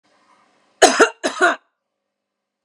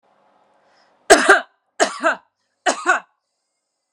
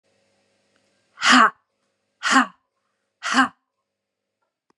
{"cough_length": "2.6 s", "cough_amplitude": 32768, "cough_signal_mean_std_ratio": 0.31, "three_cough_length": "3.9 s", "three_cough_amplitude": 32768, "three_cough_signal_mean_std_ratio": 0.31, "exhalation_length": "4.8 s", "exhalation_amplitude": 27293, "exhalation_signal_mean_std_ratio": 0.29, "survey_phase": "beta (2021-08-13 to 2022-03-07)", "age": "45-64", "gender": "Female", "wearing_mask": "No", "symptom_cough_any": true, "symptom_sore_throat": true, "smoker_status": "Ex-smoker", "respiratory_condition_asthma": false, "respiratory_condition_other": false, "recruitment_source": "REACT", "submission_delay": "0 days", "covid_test_result": "Negative", "covid_test_method": "RT-qPCR"}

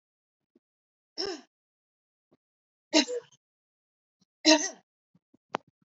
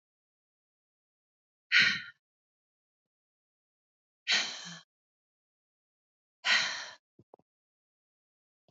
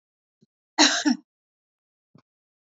{"three_cough_length": "6.0 s", "three_cough_amplitude": 14974, "three_cough_signal_mean_std_ratio": 0.21, "exhalation_length": "8.7 s", "exhalation_amplitude": 10741, "exhalation_signal_mean_std_ratio": 0.24, "cough_length": "2.6 s", "cough_amplitude": 22209, "cough_signal_mean_std_ratio": 0.27, "survey_phase": "beta (2021-08-13 to 2022-03-07)", "age": "45-64", "gender": "Female", "wearing_mask": "No", "symptom_none": true, "smoker_status": "Never smoked", "respiratory_condition_asthma": false, "respiratory_condition_other": false, "recruitment_source": "REACT", "submission_delay": "3 days", "covid_test_result": "Negative", "covid_test_method": "RT-qPCR"}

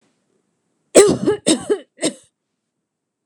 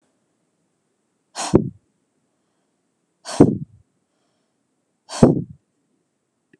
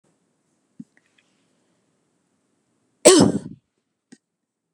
{"three_cough_length": "3.3 s", "three_cough_amplitude": 32768, "three_cough_signal_mean_std_ratio": 0.33, "exhalation_length": "6.6 s", "exhalation_amplitude": 32768, "exhalation_signal_mean_std_ratio": 0.21, "cough_length": "4.7 s", "cough_amplitude": 32768, "cough_signal_mean_std_ratio": 0.2, "survey_phase": "beta (2021-08-13 to 2022-03-07)", "age": "18-44", "gender": "Female", "wearing_mask": "No", "symptom_none": true, "smoker_status": "Never smoked", "respiratory_condition_asthma": false, "respiratory_condition_other": false, "recruitment_source": "REACT", "submission_delay": "0 days", "covid_test_result": "Negative", "covid_test_method": "RT-qPCR", "influenza_a_test_result": "Negative", "influenza_b_test_result": "Negative"}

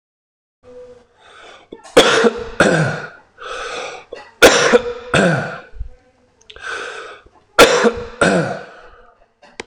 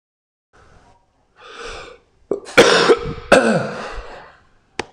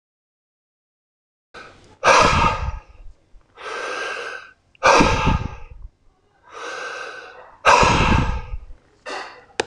{"three_cough_length": "9.7 s", "three_cough_amplitude": 26028, "three_cough_signal_mean_std_ratio": 0.44, "cough_length": "4.9 s", "cough_amplitude": 26028, "cough_signal_mean_std_ratio": 0.38, "exhalation_length": "9.7 s", "exhalation_amplitude": 26028, "exhalation_signal_mean_std_ratio": 0.45, "survey_phase": "beta (2021-08-13 to 2022-03-07)", "age": "45-64", "gender": "Male", "wearing_mask": "No", "symptom_runny_or_blocked_nose": true, "symptom_onset": "4 days", "smoker_status": "Ex-smoker", "respiratory_condition_asthma": false, "respiratory_condition_other": false, "recruitment_source": "Test and Trace", "submission_delay": "1 day", "covid_test_result": "Positive", "covid_test_method": "RT-qPCR", "covid_ct_value": 18.7, "covid_ct_gene": "ORF1ab gene", "covid_ct_mean": 22.4, "covid_viral_load": "44000 copies/ml", "covid_viral_load_category": "Low viral load (10K-1M copies/ml)"}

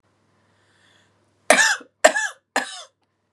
{"three_cough_length": "3.3 s", "three_cough_amplitude": 32767, "three_cough_signal_mean_std_ratio": 0.3, "survey_phase": "beta (2021-08-13 to 2022-03-07)", "age": "18-44", "gender": "Female", "wearing_mask": "No", "symptom_cough_any": true, "symptom_sore_throat": true, "symptom_onset": "5 days", "smoker_status": "Never smoked", "respiratory_condition_asthma": false, "respiratory_condition_other": false, "recruitment_source": "Test and Trace", "submission_delay": "2 days", "covid_test_result": "Negative", "covid_test_method": "RT-qPCR"}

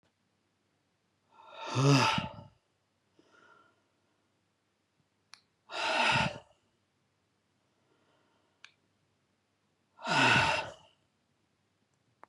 {"exhalation_length": "12.3 s", "exhalation_amplitude": 7934, "exhalation_signal_mean_std_ratio": 0.31, "survey_phase": "beta (2021-08-13 to 2022-03-07)", "age": "65+", "gender": "Male", "wearing_mask": "No", "symptom_new_continuous_cough": true, "symptom_runny_or_blocked_nose": true, "symptom_shortness_of_breath": true, "symptom_fatigue": true, "symptom_fever_high_temperature": true, "symptom_headache": true, "symptom_onset": "5 days", "smoker_status": "Never smoked", "respiratory_condition_asthma": false, "respiratory_condition_other": false, "recruitment_source": "Test and Trace", "submission_delay": "2 days", "covid_test_result": "Positive", "covid_test_method": "RT-qPCR"}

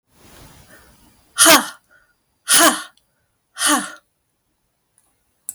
{"exhalation_length": "5.5 s", "exhalation_amplitude": 32768, "exhalation_signal_mean_std_ratio": 0.31, "survey_phase": "beta (2021-08-13 to 2022-03-07)", "age": "45-64", "gender": "Female", "wearing_mask": "No", "symptom_none": true, "smoker_status": "Ex-smoker", "respiratory_condition_asthma": false, "respiratory_condition_other": false, "recruitment_source": "REACT", "submission_delay": "0 days", "covid_test_result": "Negative", "covid_test_method": "RT-qPCR"}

